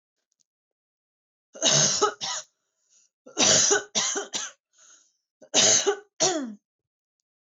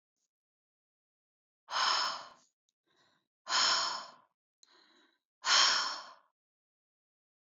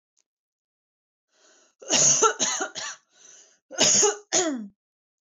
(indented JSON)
{
  "three_cough_length": "7.5 s",
  "three_cough_amplitude": 16025,
  "three_cough_signal_mean_std_ratio": 0.43,
  "exhalation_length": "7.4 s",
  "exhalation_amplitude": 7081,
  "exhalation_signal_mean_std_ratio": 0.36,
  "cough_length": "5.2 s",
  "cough_amplitude": 14851,
  "cough_signal_mean_std_ratio": 0.43,
  "survey_phase": "beta (2021-08-13 to 2022-03-07)",
  "age": "18-44",
  "gender": "Female",
  "wearing_mask": "No",
  "symptom_runny_or_blocked_nose": true,
  "symptom_fatigue": true,
  "symptom_onset": "5 days",
  "smoker_status": "Ex-smoker",
  "respiratory_condition_asthma": false,
  "respiratory_condition_other": false,
  "recruitment_source": "REACT",
  "submission_delay": "2 days",
  "covid_test_result": "Negative",
  "covid_test_method": "RT-qPCR",
  "influenza_a_test_result": "Negative",
  "influenza_b_test_result": "Negative"
}